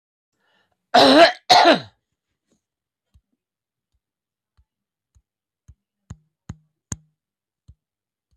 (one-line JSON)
{"cough_length": "8.4 s", "cough_amplitude": 27516, "cough_signal_mean_std_ratio": 0.23, "survey_phase": "beta (2021-08-13 to 2022-03-07)", "age": "65+", "gender": "Male", "wearing_mask": "No", "symptom_fatigue": true, "smoker_status": "Never smoked", "respiratory_condition_asthma": false, "respiratory_condition_other": false, "recruitment_source": "REACT", "submission_delay": "1 day", "covid_test_result": "Negative", "covid_test_method": "RT-qPCR"}